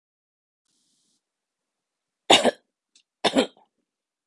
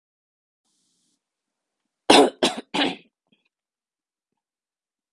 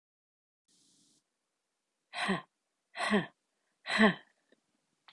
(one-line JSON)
{"cough_length": "4.3 s", "cough_amplitude": 32768, "cough_signal_mean_std_ratio": 0.21, "three_cough_length": "5.1 s", "three_cough_amplitude": 32768, "three_cough_signal_mean_std_ratio": 0.22, "exhalation_length": "5.1 s", "exhalation_amplitude": 8724, "exhalation_signal_mean_std_ratio": 0.28, "survey_phase": "beta (2021-08-13 to 2022-03-07)", "age": "18-44", "gender": "Female", "wearing_mask": "No", "symptom_none": true, "smoker_status": "Never smoked", "respiratory_condition_asthma": false, "respiratory_condition_other": false, "recruitment_source": "REACT", "submission_delay": "4 days", "covid_test_result": "Negative", "covid_test_method": "RT-qPCR", "influenza_a_test_result": "Negative", "influenza_b_test_result": "Negative"}